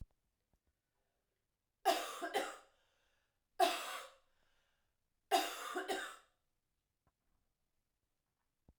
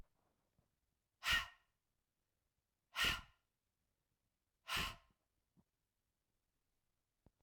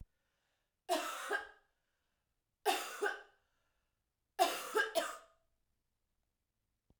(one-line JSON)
{"three_cough_length": "8.8 s", "three_cough_amplitude": 4219, "three_cough_signal_mean_std_ratio": 0.31, "exhalation_length": "7.4 s", "exhalation_amplitude": 2066, "exhalation_signal_mean_std_ratio": 0.24, "cough_length": "7.0 s", "cough_amplitude": 4229, "cough_signal_mean_std_ratio": 0.36, "survey_phase": "alpha (2021-03-01 to 2021-08-12)", "age": "18-44", "gender": "Female", "wearing_mask": "No", "symptom_cough_any": true, "symptom_abdominal_pain": true, "symptom_diarrhoea": true, "symptom_fatigue": true, "symptom_fever_high_temperature": true, "symptom_headache": true, "symptom_loss_of_taste": true, "smoker_status": "Never smoked", "respiratory_condition_asthma": false, "respiratory_condition_other": false, "recruitment_source": "Test and Trace", "submission_delay": "2 days", "covid_test_result": "Positive", "covid_test_method": "RT-qPCR", "covid_ct_value": 20.1, "covid_ct_gene": "ORF1ab gene"}